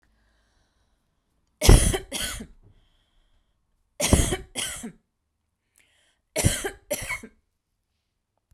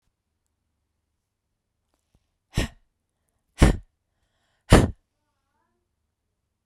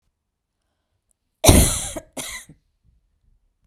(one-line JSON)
{"three_cough_length": "8.5 s", "three_cough_amplitude": 32767, "three_cough_signal_mean_std_ratio": 0.28, "exhalation_length": "6.7 s", "exhalation_amplitude": 32767, "exhalation_signal_mean_std_ratio": 0.18, "cough_length": "3.7 s", "cough_amplitude": 32768, "cough_signal_mean_std_ratio": 0.26, "survey_phase": "beta (2021-08-13 to 2022-03-07)", "age": "45-64", "gender": "Female", "wearing_mask": "No", "symptom_none": true, "smoker_status": "Never smoked", "respiratory_condition_asthma": false, "respiratory_condition_other": false, "recruitment_source": "REACT", "submission_delay": "2 days", "covid_test_result": "Negative", "covid_test_method": "RT-qPCR"}